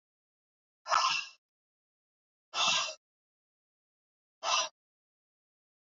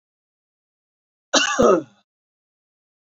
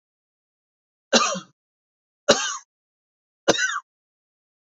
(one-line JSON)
{"exhalation_length": "5.8 s", "exhalation_amplitude": 6532, "exhalation_signal_mean_std_ratio": 0.32, "cough_length": "3.2 s", "cough_amplitude": 25887, "cough_signal_mean_std_ratio": 0.29, "three_cough_length": "4.7 s", "three_cough_amplitude": 27774, "three_cough_signal_mean_std_ratio": 0.29, "survey_phase": "alpha (2021-03-01 to 2021-08-12)", "age": "18-44", "gender": "Male", "wearing_mask": "No", "symptom_none": true, "smoker_status": "Never smoked", "respiratory_condition_asthma": false, "respiratory_condition_other": false, "recruitment_source": "REACT", "submission_delay": "1 day", "covid_test_result": "Negative", "covid_test_method": "RT-qPCR"}